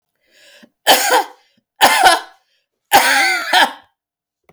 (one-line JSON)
{"three_cough_length": "4.5 s", "three_cough_amplitude": 32768, "three_cough_signal_mean_std_ratio": 0.47, "survey_phase": "beta (2021-08-13 to 2022-03-07)", "age": "65+", "gender": "Female", "wearing_mask": "No", "symptom_none": true, "smoker_status": "Never smoked", "respiratory_condition_asthma": false, "respiratory_condition_other": false, "recruitment_source": "REACT", "submission_delay": "1 day", "covid_test_result": "Negative", "covid_test_method": "RT-qPCR"}